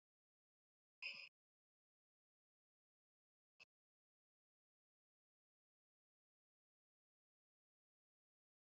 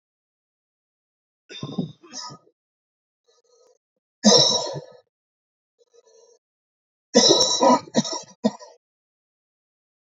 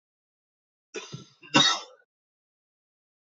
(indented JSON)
{
  "exhalation_length": "8.6 s",
  "exhalation_amplitude": 436,
  "exhalation_signal_mean_std_ratio": 0.13,
  "three_cough_length": "10.2 s",
  "three_cough_amplitude": 27686,
  "three_cough_signal_mean_std_ratio": 0.3,
  "cough_length": "3.3 s",
  "cough_amplitude": 14528,
  "cough_signal_mean_std_ratio": 0.24,
  "survey_phase": "alpha (2021-03-01 to 2021-08-12)",
  "age": "45-64",
  "gender": "Male",
  "wearing_mask": "No",
  "symptom_cough_any": true,
  "symptom_shortness_of_breath": true,
  "symptom_fatigue": true,
  "symptom_fever_high_temperature": true,
  "symptom_headache": true,
  "symptom_change_to_sense_of_smell_or_taste": true,
  "symptom_onset": "3 days",
  "smoker_status": "Current smoker (e-cigarettes or vapes only)",
  "respiratory_condition_asthma": false,
  "respiratory_condition_other": false,
  "recruitment_source": "Test and Trace",
  "submission_delay": "2 days",
  "covid_test_result": "Positive",
  "covid_test_method": "RT-qPCR",
  "covid_ct_value": 17.7,
  "covid_ct_gene": "ORF1ab gene",
  "covid_ct_mean": 18.2,
  "covid_viral_load": "1100000 copies/ml",
  "covid_viral_load_category": "High viral load (>1M copies/ml)"
}